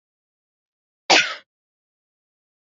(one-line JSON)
{"cough_length": "2.6 s", "cough_amplitude": 28485, "cough_signal_mean_std_ratio": 0.21, "survey_phase": "beta (2021-08-13 to 2022-03-07)", "age": "45-64", "gender": "Female", "wearing_mask": "No", "symptom_none": true, "smoker_status": "Ex-smoker", "respiratory_condition_asthma": false, "respiratory_condition_other": false, "recruitment_source": "REACT", "submission_delay": "1 day", "covid_test_result": "Negative", "covid_test_method": "RT-qPCR", "influenza_a_test_result": "Negative", "influenza_b_test_result": "Negative"}